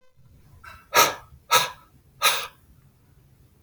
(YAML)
exhalation_length: 3.6 s
exhalation_amplitude: 24190
exhalation_signal_mean_std_ratio: 0.33
survey_phase: beta (2021-08-13 to 2022-03-07)
age: 65+
gender: Male
wearing_mask: 'No'
symptom_none: true
smoker_status: Ex-smoker
respiratory_condition_asthma: false
respiratory_condition_other: false
recruitment_source: REACT
submission_delay: 2 days
covid_test_result: Negative
covid_test_method: RT-qPCR
influenza_a_test_result: Negative
influenza_b_test_result: Negative